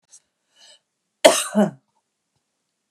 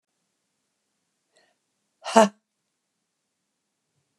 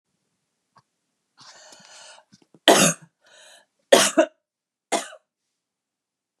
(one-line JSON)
{"cough_length": "2.9 s", "cough_amplitude": 32768, "cough_signal_mean_std_ratio": 0.24, "exhalation_length": "4.2 s", "exhalation_amplitude": 28816, "exhalation_signal_mean_std_ratio": 0.14, "three_cough_length": "6.4 s", "three_cough_amplitude": 32541, "three_cough_signal_mean_std_ratio": 0.24, "survey_phase": "beta (2021-08-13 to 2022-03-07)", "age": "45-64", "gender": "Female", "wearing_mask": "No", "symptom_none": true, "smoker_status": "Ex-smoker", "respiratory_condition_asthma": true, "respiratory_condition_other": false, "recruitment_source": "REACT", "submission_delay": "4 days", "covid_test_result": "Negative", "covid_test_method": "RT-qPCR", "influenza_a_test_result": "Negative", "influenza_b_test_result": "Negative"}